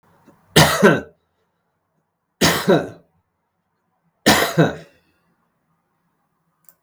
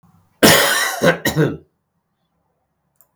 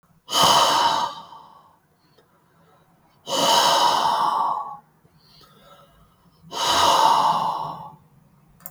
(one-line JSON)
{"three_cough_length": "6.8 s", "three_cough_amplitude": 32768, "three_cough_signal_mean_std_ratio": 0.33, "cough_length": "3.2 s", "cough_amplitude": 32768, "cough_signal_mean_std_ratio": 0.43, "exhalation_length": "8.7 s", "exhalation_amplitude": 22656, "exhalation_signal_mean_std_ratio": 0.56, "survey_phase": "beta (2021-08-13 to 2022-03-07)", "age": "65+", "gender": "Male", "wearing_mask": "No", "symptom_none": true, "smoker_status": "Ex-smoker", "respiratory_condition_asthma": false, "respiratory_condition_other": false, "recruitment_source": "REACT", "submission_delay": "2 days", "covid_test_result": "Negative", "covid_test_method": "RT-qPCR", "influenza_a_test_result": "Negative", "influenza_b_test_result": "Negative"}